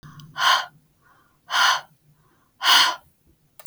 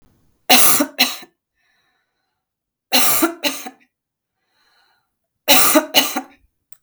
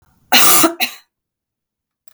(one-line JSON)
{"exhalation_length": "3.7 s", "exhalation_amplitude": 32565, "exhalation_signal_mean_std_ratio": 0.4, "three_cough_length": "6.8 s", "three_cough_amplitude": 32768, "three_cough_signal_mean_std_ratio": 0.38, "cough_length": "2.1 s", "cough_amplitude": 32768, "cough_signal_mean_std_ratio": 0.4, "survey_phase": "beta (2021-08-13 to 2022-03-07)", "age": "45-64", "gender": "Female", "wearing_mask": "No", "symptom_cough_any": true, "smoker_status": "Ex-smoker", "respiratory_condition_asthma": false, "respiratory_condition_other": false, "recruitment_source": "Test and Trace", "submission_delay": "1 day", "covid_test_result": "Positive", "covid_test_method": "RT-qPCR", "covid_ct_value": 15.9, "covid_ct_gene": "N gene"}